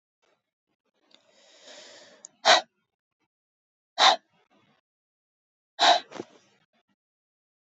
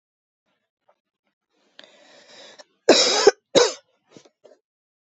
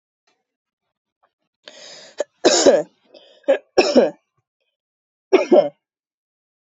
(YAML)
exhalation_length: 7.8 s
exhalation_amplitude: 19836
exhalation_signal_mean_std_ratio: 0.21
cough_length: 5.1 s
cough_amplitude: 32767
cough_signal_mean_std_ratio: 0.25
three_cough_length: 6.7 s
three_cough_amplitude: 32767
three_cough_signal_mean_std_ratio: 0.32
survey_phase: beta (2021-08-13 to 2022-03-07)
age: 45-64
gender: Female
wearing_mask: 'No'
symptom_cough_any: true
symptom_sore_throat: true
symptom_headache: true
symptom_onset: 3 days
smoker_status: Never smoked
respiratory_condition_asthma: false
respiratory_condition_other: false
recruitment_source: Test and Trace
submission_delay: 1 day
covid_test_result: Positive
covid_test_method: ePCR